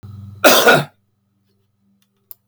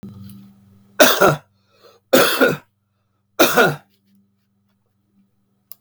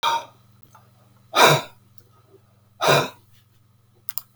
{"cough_length": "2.5 s", "cough_amplitude": 32768, "cough_signal_mean_std_ratio": 0.35, "three_cough_length": "5.8 s", "three_cough_amplitude": 32768, "three_cough_signal_mean_std_ratio": 0.35, "exhalation_length": "4.4 s", "exhalation_amplitude": 32757, "exhalation_signal_mean_std_ratio": 0.33, "survey_phase": "beta (2021-08-13 to 2022-03-07)", "age": "65+", "gender": "Male", "wearing_mask": "No", "symptom_none": true, "smoker_status": "Never smoked", "respiratory_condition_asthma": false, "respiratory_condition_other": false, "recruitment_source": "REACT", "submission_delay": "3 days", "covid_test_result": "Negative", "covid_test_method": "RT-qPCR"}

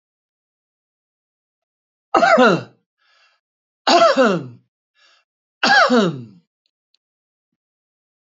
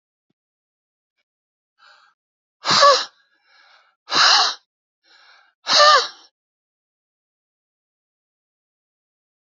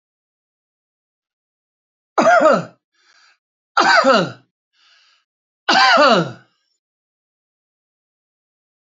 {"three_cough_length": "8.3 s", "three_cough_amplitude": 32575, "three_cough_signal_mean_std_ratio": 0.35, "exhalation_length": "9.5 s", "exhalation_amplitude": 28884, "exhalation_signal_mean_std_ratio": 0.28, "cough_length": "8.9 s", "cough_amplitude": 29368, "cough_signal_mean_std_ratio": 0.34, "survey_phase": "alpha (2021-03-01 to 2021-08-12)", "age": "65+", "gender": "Male", "wearing_mask": "No", "symptom_none": true, "smoker_status": "Never smoked", "respiratory_condition_asthma": false, "respiratory_condition_other": false, "recruitment_source": "REACT", "submission_delay": "7 days", "covid_test_result": "Negative", "covid_test_method": "RT-qPCR"}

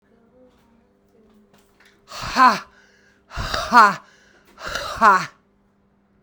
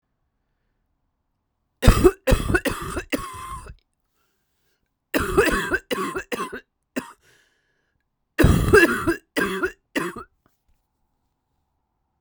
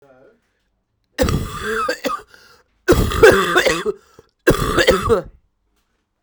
{"exhalation_length": "6.2 s", "exhalation_amplitude": 32768, "exhalation_signal_mean_std_ratio": 0.32, "three_cough_length": "12.2 s", "three_cough_amplitude": 32768, "three_cough_signal_mean_std_ratio": 0.37, "cough_length": "6.2 s", "cough_amplitude": 32768, "cough_signal_mean_std_ratio": 0.48, "survey_phase": "beta (2021-08-13 to 2022-03-07)", "age": "45-64", "gender": "Female", "wearing_mask": "No", "symptom_cough_any": true, "symptom_new_continuous_cough": true, "symptom_shortness_of_breath": true, "symptom_sore_throat": true, "symptom_fatigue": true, "symptom_headache": true, "symptom_change_to_sense_of_smell_or_taste": true, "symptom_loss_of_taste": true, "symptom_other": true, "symptom_onset": "6 days", "smoker_status": "Never smoked", "respiratory_condition_asthma": false, "respiratory_condition_other": false, "recruitment_source": "Test and Trace", "submission_delay": "1 day", "covid_test_result": "Positive", "covid_test_method": "RT-qPCR"}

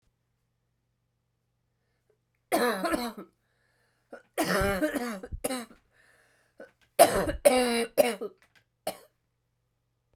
{"three_cough_length": "10.2 s", "three_cough_amplitude": 18403, "three_cough_signal_mean_std_ratio": 0.37, "survey_phase": "beta (2021-08-13 to 2022-03-07)", "age": "45-64", "gender": "Female", "wearing_mask": "No", "symptom_cough_any": true, "symptom_runny_or_blocked_nose": true, "symptom_change_to_sense_of_smell_or_taste": true, "smoker_status": "Never smoked", "respiratory_condition_asthma": false, "respiratory_condition_other": false, "recruitment_source": "Test and Trace", "submission_delay": "6 days", "covid_test_method": "PCR"}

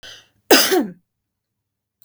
{"cough_length": "2.0 s", "cough_amplitude": 32768, "cough_signal_mean_std_ratio": 0.33, "survey_phase": "beta (2021-08-13 to 2022-03-07)", "age": "45-64", "gender": "Female", "wearing_mask": "No", "symptom_headache": true, "smoker_status": "Never smoked", "respiratory_condition_asthma": false, "respiratory_condition_other": false, "recruitment_source": "REACT", "submission_delay": "1 day", "covid_test_result": "Negative", "covid_test_method": "RT-qPCR", "influenza_a_test_result": "Negative", "influenza_b_test_result": "Negative"}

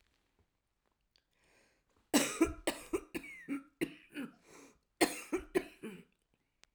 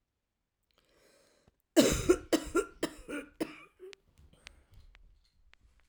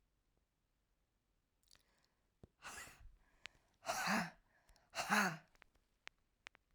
{"three_cough_length": "6.7 s", "three_cough_amplitude": 6841, "three_cough_signal_mean_std_ratio": 0.32, "cough_length": "5.9 s", "cough_amplitude": 11966, "cough_signal_mean_std_ratio": 0.28, "exhalation_length": "6.7 s", "exhalation_amplitude": 2410, "exhalation_signal_mean_std_ratio": 0.3, "survey_phase": "alpha (2021-03-01 to 2021-08-12)", "age": "45-64", "gender": "Female", "wearing_mask": "No", "symptom_diarrhoea": true, "symptom_change_to_sense_of_smell_or_taste": true, "symptom_loss_of_taste": true, "symptom_onset": "6 days", "smoker_status": "Never smoked", "respiratory_condition_asthma": false, "respiratory_condition_other": false, "recruitment_source": "Test and Trace", "submission_delay": "2 days", "covid_test_result": "Positive", "covid_test_method": "RT-qPCR", "covid_ct_value": 21.7, "covid_ct_gene": "ORF1ab gene", "covid_ct_mean": 22.2, "covid_viral_load": "52000 copies/ml", "covid_viral_load_category": "Low viral load (10K-1M copies/ml)"}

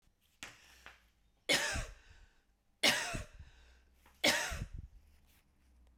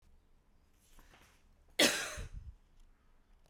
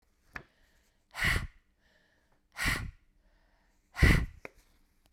{"three_cough_length": "6.0 s", "three_cough_amplitude": 6469, "three_cough_signal_mean_std_ratio": 0.37, "cough_length": "3.5 s", "cough_amplitude": 6439, "cough_signal_mean_std_ratio": 0.29, "exhalation_length": "5.1 s", "exhalation_amplitude": 11849, "exhalation_signal_mean_std_ratio": 0.3, "survey_phase": "beta (2021-08-13 to 2022-03-07)", "age": "45-64", "gender": "Female", "wearing_mask": "No", "symptom_cough_any": true, "symptom_runny_or_blocked_nose": true, "symptom_sore_throat": true, "symptom_fatigue": true, "symptom_headache": true, "smoker_status": "Never smoked", "respiratory_condition_asthma": false, "respiratory_condition_other": false, "recruitment_source": "Test and Trace", "submission_delay": "1 day", "covid_test_result": "Positive", "covid_test_method": "RT-qPCR", "covid_ct_value": 27.5, "covid_ct_gene": "ORF1ab gene"}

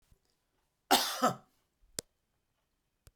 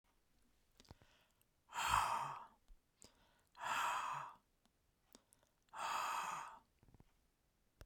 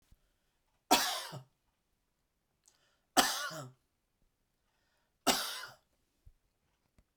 {"cough_length": "3.2 s", "cough_amplitude": 10258, "cough_signal_mean_std_ratio": 0.25, "exhalation_length": "7.9 s", "exhalation_amplitude": 3410, "exhalation_signal_mean_std_ratio": 0.44, "three_cough_length": "7.2 s", "three_cough_amplitude": 10412, "three_cough_signal_mean_std_ratio": 0.27, "survey_phase": "beta (2021-08-13 to 2022-03-07)", "age": "45-64", "gender": "Male", "wearing_mask": "No", "symptom_none": true, "smoker_status": "Never smoked", "respiratory_condition_asthma": false, "respiratory_condition_other": false, "recruitment_source": "REACT", "submission_delay": "2 days", "covid_test_result": "Negative", "covid_test_method": "RT-qPCR"}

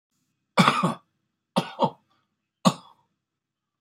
{"cough_length": "3.8 s", "cough_amplitude": 22977, "cough_signal_mean_std_ratio": 0.29, "survey_phase": "beta (2021-08-13 to 2022-03-07)", "age": "65+", "gender": "Male", "wearing_mask": "No", "symptom_none": true, "symptom_onset": "12 days", "smoker_status": "Never smoked", "respiratory_condition_asthma": true, "respiratory_condition_other": false, "recruitment_source": "REACT", "submission_delay": "2 days", "covid_test_result": "Negative", "covid_test_method": "RT-qPCR", "influenza_a_test_result": "Negative", "influenza_b_test_result": "Negative"}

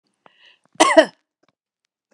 {"cough_length": "2.1 s", "cough_amplitude": 32768, "cough_signal_mean_std_ratio": 0.24, "survey_phase": "beta (2021-08-13 to 2022-03-07)", "age": "45-64", "gender": "Female", "wearing_mask": "No", "symptom_none": true, "smoker_status": "Never smoked", "respiratory_condition_asthma": false, "respiratory_condition_other": false, "recruitment_source": "REACT", "submission_delay": "1 day", "covid_test_result": "Negative", "covid_test_method": "RT-qPCR"}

